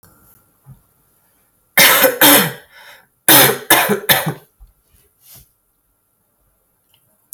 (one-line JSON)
{"cough_length": "7.3 s", "cough_amplitude": 32768, "cough_signal_mean_std_ratio": 0.36, "survey_phase": "alpha (2021-03-01 to 2021-08-12)", "age": "18-44", "gender": "Female", "wearing_mask": "No", "symptom_cough_any": true, "symptom_fatigue": true, "symptom_headache": true, "symptom_onset": "12 days", "smoker_status": "Current smoker (1 to 10 cigarettes per day)", "respiratory_condition_asthma": false, "respiratory_condition_other": false, "recruitment_source": "REACT", "submission_delay": "2 days", "covid_test_result": "Negative", "covid_test_method": "RT-qPCR"}